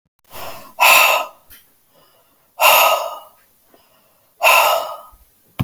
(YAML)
exhalation_length: 5.6 s
exhalation_amplitude: 32768
exhalation_signal_mean_std_ratio: 0.43
survey_phase: beta (2021-08-13 to 2022-03-07)
age: 45-64
gender: Female
wearing_mask: 'No'
symptom_cough_any: true
symptom_runny_or_blocked_nose: true
smoker_status: Ex-smoker
respiratory_condition_asthma: false
respiratory_condition_other: false
recruitment_source: Test and Trace
submission_delay: 1 day
covid_test_result: Positive
covid_test_method: RT-qPCR
covid_ct_value: 28.5
covid_ct_gene: ORF1ab gene
covid_ct_mean: 29.0
covid_viral_load: 310 copies/ml
covid_viral_load_category: Minimal viral load (< 10K copies/ml)